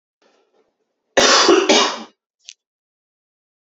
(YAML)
cough_length: 3.7 s
cough_amplitude: 29872
cough_signal_mean_std_ratio: 0.38
survey_phase: beta (2021-08-13 to 2022-03-07)
age: 18-44
gender: Male
wearing_mask: 'No'
symptom_none: true
smoker_status: Ex-smoker
respiratory_condition_asthma: false
respiratory_condition_other: false
recruitment_source: Test and Trace
submission_delay: 2 days
covid_test_result: Positive
covid_test_method: RT-qPCR
covid_ct_value: 25.2
covid_ct_gene: ORF1ab gene
covid_ct_mean: 25.5
covid_viral_load: 4200 copies/ml
covid_viral_load_category: Minimal viral load (< 10K copies/ml)